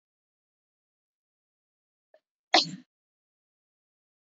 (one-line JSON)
{"cough_length": "4.4 s", "cough_amplitude": 15885, "cough_signal_mean_std_ratio": 0.13, "survey_phase": "beta (2021-08-13 to 2022-03-07)", "age": "18-44", "gender": "Female", "wearing_mask": "No", "symptom_cough_any": true, "symptom_new_continuous_cough": true, "symptom_runny_or_blocked_nose": true, "symptom_sore_throat": true, "symptom_fatigue": true, "symptom_headache": true, "symptom_onset": "12 days", "smoker_status": "Never smoked", "respiratory_condition_asthma": false, "respiratory_condition_other": false, "recruitment_source": "REACT", "submission_delay": "1 day", "covid_test_result": "Negative", "covid_test_method": "RT-qPCR", "influenza_a_test_result": "Unknown/Void", "influenza_b_test_result": "Unknown/Void"}